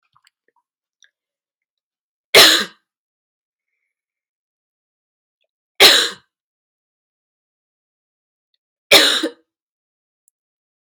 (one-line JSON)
{"three_cough_length": "11.0 s", "three_cough_amplitude": 32768, "three_cough_signal_mean_std_ratio": 0.22, "survey_phase": "alpha (2021-03-01 to 2021-08-12)", "age": "45-64", "gender": "Female", "wearing_mask": "No", "symptom_fatigue": true, "symptom_change_to_sense_of_smell_or_taste": true, "symptom_onset": "4 days", "smoker_status": "Never smoked", "respiratory_condition_asthma": false, "respiratory_condition_other": false, "recruitment_source": "Test and Trace", "submission_delay": "3 days", "covid_test_result": "Positive", "covid_test_method": "RT-qPCR", "covid_ct_value": 21.0, "covid_ct_gene": "ORF1ab gene", "covid_ct_mean": 21.6, "covid_viral_load": "83000 copies/ml", "covid_viral_load_category": "Low viral load (10K-1M copies/ml)"}